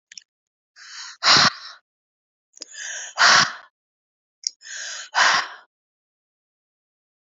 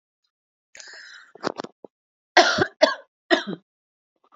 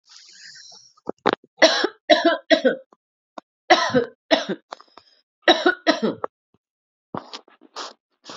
{
  "exhalation_length": "7.3 s",
  "exhalation_amplitude": 27218,
  "exhalation_signal_mean_std_ratio": 0.32,
  "cough_length": "4.4 s",
  "cough_amplitude": 32767,
  "cough_signal_mean_std_ratio": 0.28,
  "three_cough_length": "8.4 s",
  "three_cough_amplitude": 31583,
  "three_cough_signal_mean_std_ratio": 0.35,
  "survey_phase": "beta (2021-08-13 to 2022-03-07)",
  "age": "18-44",
  "gender": "Female",
  "wearing_mask": "No",
  "symptom_headache": true,
  "symptom_loss_of_taste": true,
  "smoker_status": "Never smoked",
  "respiratory_condition_asthma": false,
  "respiratory_condition_other": false,
  "recruitment_source": "Test and Trace",
  "submission_delay": "-1 day",
  "covid_test_result": "Negative",
  "covid_test_method": "LFT"
}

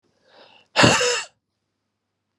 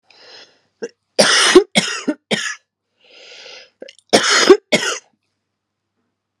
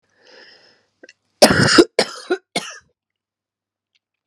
{
  "exhalation_length": "2.4 s",
  "exhalation_amplitude": 30031,
  "exhalation_signal_mean_std_ratio": 0.34,
  "cough_length": "6.4 s",
  "cough_amplitude": 32768,
  "cough_signal_mean_std_ratio": 0.36,
  "three_cough_length": "4.3 s",
  "three_cough_amplitude": 32768,
  "three_cough_signal_mean_std_ratio": 0.29,
  "survey_phase": "alpha (2021-03-01 to 2021-08-12)",
  "age": "45-64",
  "gender": "Female",
  "wearing_mask": "No",
  "symptom_cough_any": true,
  "symptom_fatigue": true,
  "symptom_headache": true,
  "symptom_change_to_sense_of_smell_or_taste": true,
  "symptom_onset": "3 days",
  "smoker_status": "Never smoked",
  "respiratory_condition_asthma": false,
  "respiratory_condition_other": false,
  "recruitment_source": "Test and Trace",
  "submission_delay": "2 days",
  "covid_test_result": "Positive",
  "covid_test_method": "RT-qPCR",
  "covid_ct_value": 22.7,
  "covid_ct_gene": "ORF1ab gene",
  "covid_ct_mean": 23.3,
  "covid_viral_load": "23000 copies/ml",
  "covid_viral_load_category": "Low viral load (10K-1M copies/ml)"
}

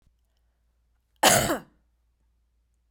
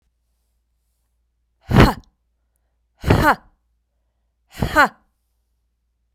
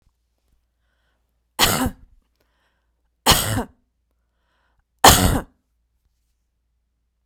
{
  "cough_length": "2.9 s",
  "cough_amplitude": 24369,
  "cough_signal_mean_std_ratio": 0.26,
  "exhalation_length": "6.1 s",
  "exhalation_amplitude": 32768,
  "exhalation_signal_mean_std_ratio": 0.26,
  "three_cough_length": "7.3 s",
  "three_cough_amplitude": 32768,
  "three_cough_signal_mean_std_ratio": 0.26,
  "survey_phase": "beta (2021-08-13 to 2022-03-07)",
  "age": "45-64",
  "gender": "Female",
  "wearing_mask": "No",
  "symptom_none": true,
  "symptom_onset": "11 days",
  "smoker_status": "Never smoked",
  "respiratory_condition_asthma": true,
  "respiratory_condition_other": false,
  "recruitment_source": "REACT",
  "submission_delay": "1 day",
  "covid_test_result": "Negative",
  "covid_test_method": "RT-qPCR"
}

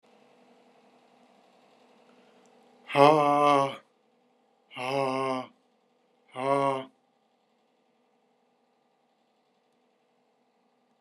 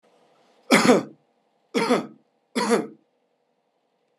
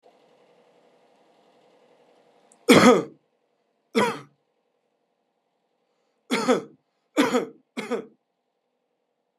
{
  "exhalation_length": "11.0 s",
  "exhalation_amplitude": 22606,
  "exhalation_signal_mean_std_ratio": 0.28,
  "three_cough_length": "4.2 s",
  "three_cough_amplitude": 26794,
  "three_cough_signal_mean_std_ratio": 0.35,
  "cough_length": "9.4 s",
  "cough_amplitude": 29269,
  "cough_signal_mean_std_ratio": 0.26,
  "survey_phase": "alpha (2021-03-01 to 2021-08-12)",
  "age": "65+",
  "gender": "Male",
  "wearing_mask": "No",
  "symptom_none": true,
  "smoker_status": "Never smoked",
  "respiratory_condition_asthma": false,
  "respiratory_condition_other": false,
  "recruitment_source": "REACT",
  "submission_delay": "2 days",
  "covid_test_result": "Negative",
  "covid_test_method": "RT-qPCR"
}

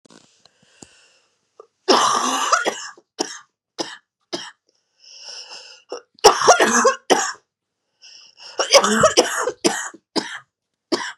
{
  "three_cough_length": "11.2 s",
  "three_cough_amplitude": 32768,
  "three_cough_signal_mean_std_ratio": 0.4,
  "survey_phase": "beta (2021-08-13 to 2022-03-07)",
  "age": "18-44",
  "gender": "Female",
  "wearing_mask": "No",
  "symptom_cough_any": true,
  "symptom_runny_or_blocked_nose": true,
  "symptom_shortness_of_breath": true,
  "symptom_fatigue": true,
  "symptom_headache": true,
  "symptom_onset": "4 days",
  "smoker_status": "Never smoked",
  "respiratory_condition_asthma": false,
  "respiratory_condition_other": false,
  "recruitment_source": "Test and Trace",
  "submission_delay": "2 days",
  "covid_test_result": "Negative",
  "covid_test_method": "RT-qPCR"
}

